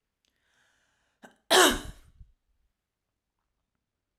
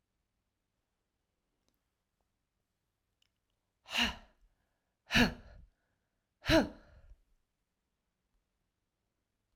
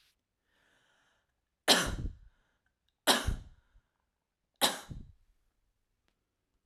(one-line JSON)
{"cough_length": "4.2 s", "cough_amplitude": 15607, "cough_signal_mean_std_ratio": 0.21, "exhalation_length": "9.6 s", "exhalation_amplitude": 6069, "exhalation_signal_mean_std_ratio": 0.2, "three_cough_length": "6.7 s", "three_cough_amplitude": 12208, "three_cough_signal_mean_std_ratio": 0.26, "survey_phase": "alpha (2021-03-01 to 2021-08-12)", "age": "45-64", "gender": "Female", "wearing_mask": "No", "symptom_none": true, "smoker_status": "Never smoked", "respiratory_condition_asthma": false, "respiratory_condition_other": false, "recruitment_source": "REACT", "submission_delay": "1 day", "covid_test_result": "Negative", "covid_test_method": "RT-qPCR"}